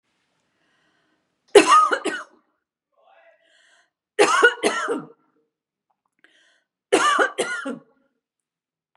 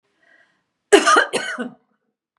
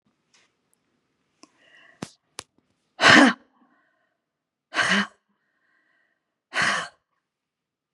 three_cough_length: 9.0 s
three_cough_amplitude: 32767
three_cough_signal_mean_std_ratio: 0.33
cough_length: 2.4 s
cough_amplitude: 32767
cough_signal_mean_std_ratio: 0.35
exhalation_length: 7.9 s
exhalation_amplitude: 29404
exhalation_signal_mean_std_ratio: 0.24
survey_phase: beta (2021-08-13 to 2022-03-07)
age: 45-64
gender: Female
wearing_mask: 'No'
symptom_none: true
smoker_status: Ex-smoker
respiratory_condition_asthma: false
respiratory_condition_other: false
recruitment_source: REACT
submission_delay: 1 day
covid_test_result: Negative
covid_test_method: RT-qPCR
influenza_a_test_result: Negative
influenza_b_test_result: Negative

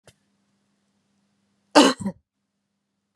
cough_length: 3.2 s
cough_amplitude: 32744
cough_signal_mean_std_ratio: 0.2
survey_phase: beta (2021-08-13 to 2022-03-07)
age: 45-64
gender: Female
wearing_mask: 'No'
symptom_none: true
smoker_status: Never smoked
respiratory_condition_asthma: true
respiratory_condition_other: false
recruitment_source: REACT
submission_delay: 3 days
covid_test_result: Negative
covid_test_method: RT-qPCR
influenza_a_test_result: Negative
influenza_b_test_result: Negative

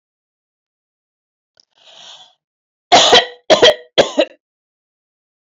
cough_length: 5.5 s
cough_amplitude: 32409
cough_signal_mean_std_ratio: 0.3
survey_phase: alpha (2021-03-01 to 2021-08-12)
age: 45-64
gender: Female
wearing_mask: 'No'
symptom_none: true
smoker_status: Ex-smoker
respiratory_condition_asthma: false
respiratory_condition_other: false
recruitment_source: REACT
submission_delay: 1 day
covid_test_result: Negative
covid_test_method: RT-qPCR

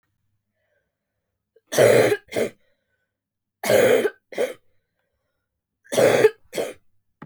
three_cough_length: 7.3 s
three_cough_amplitude: 22996
three_cough_signal_mean_std_ratio: 0.38
survey_phase: beta (2021-08-13 to 2022-03-07)
age: 18-44
gender: Female
wearing_mask: 'No'
symptom_cough_any: true
symptom_runny_or_blocked_nose: true
symptom_shortness_of_breath: true
symptom_sore_throat: true
symptom_fatigue: true
symptom_headache: true
symptom_other: true
smoker_status: Never smoked
respiratory_condition_asthma: false
respiratory_condition_other: false
recruitment_source: Test and Trace
submission_delay: 2 days
covid_test_result: Positive
covid_test_method: RT-qPCR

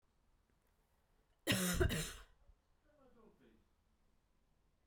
cough_length: 4.9 s
cough_amplitude: 2849
cough_signal_mean_std_ratio: 0.31
survey_phase: beta (2021-08-13 to 2022-03-07)
age: 18-44
gender: Female
wearing_mask: 'No'
symptom_cough_any: true
symptom_runny_or_blocked_nose: true
symptom_sore_throat: true
symptom_fatigue: true
symptom_headache: true
symptom_change_to_sense_of_smell_or_taste: true
smoker_status: Never smoked
respiratory_condition_asthma: false
respiratory_condition_other: false
recruitment_source: Test and Trace
submission_delay: 2 days
covid_test_result: Positive
covid_test_method: RT-qPCR
covid_ct_value: 15.1
covid_ct_gene: ORF1ab gene
covid_ct_mean: 15.5
covid_viral_load: 8100000 copies/ml
covid_viral_load_category: High viral load (>1M copies/ml)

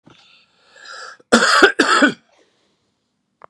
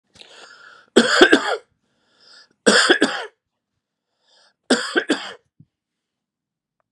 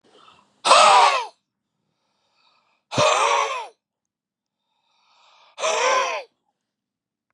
cough_length: 3.5 s
cough_amplitude: 32768
cough_signal_mean_std_ratio: 0.37
three_cough_length: 6.9 s
three_cough_amplitude: 32768
three_cough_signal_mean_std_ratio: 0.33
exhalation_length: 7.3 s
exhalation_amplitude: 28173
exhalation_signal_mean_std_ratio: 0.39
survey_phase: beta (2021-08-13 to 2022-03-07)
age: 65+
gender: Male
wearing_mask: 'No'
symptom_none: true
smoker_status: Ex-smoker
respiratory_condition_asthma: false
respiratory_condition_other: false
recruitment_source: REACT
submission_delay: 2 days
covid_test_result: Negative
covid_test_method: RT-qPCR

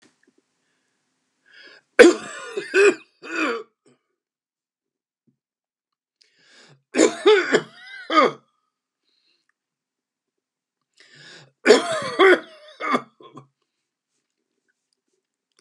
three_cough_length: 15.6 s
three_cough_amplitude: 32768
three_cough_signal_mean_std_ratio: 0.28
survey_phase: beta (2021-08-13 to 2022-03-07)
age: 65+
gender: Male
wearing_mask: 'No'
symptom_other: true
symptom_onset: 12 days
smoker_status: Ex-smoker
respiratory_condition_asthma: false
respiratory_condition_other: false
recruitment_source: REACT
submission_delay: 0 days
covid_test_result: Negative
covid_test_method: RT-qPCR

